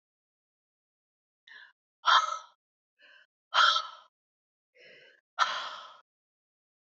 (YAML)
exhalation_length: 6.9 s
exhalation_amplitude: 11445
exhalation_signal_mean_std_ratio: 0.27
survey_phase: beta (2021-08-13 to 2022-03-07)
age: 18-44
gender: Female
wearing_mask: 'No'
symptom_none: true
smoker_status: Never smoked
respiratory_condition_asthma: false
respiratory_condition_other: false
recruitment_source: REACT
submission_delay: 2 days
covid_test_result: Negative
covid_test_method: RT-qPCR
influenza_a_test_result: Negative
influenza_b_test_result: Negative